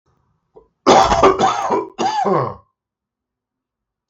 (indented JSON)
{
  "three_cough_length": "4.1 s",
  "three_cough_amplitude": 32768,
  "three_cough_signal_mean_std_ratio": 0.47,
  "survey_phase": "beta (2021-08-13 to 2022-03-07)",
  "age": "45-64",
  "gender": "Male",
  "wearing_mask": "No",
  "symptom_cough_any": true,
  "symptom_runny_or_blocked_nose": true,
  "symptom_fatigue": true,
  "symptom_other": true,
  "symptom_onset": "4 days",
  "smoker_status": "Ex-smoker",
  "respiratory_condition_asthma": false,
  "respiratory_condition_other": false,
  "recruitment_source": "Test and Trace",
  "submission_delay": "2 days",
  "covid_test_result": "Positive",
  "covid_test_method": "RT-qPCR",
  "covid_ct_value": 19.8,
  "covid_ct_gene": "ORF1ab gene",
  "covid_ct_mean": 20.2,
  "covid_viral_load": "230000 copies/ml",
  "covid_viral_load_category": "Low viral load (10K-1M copies/ml)"
}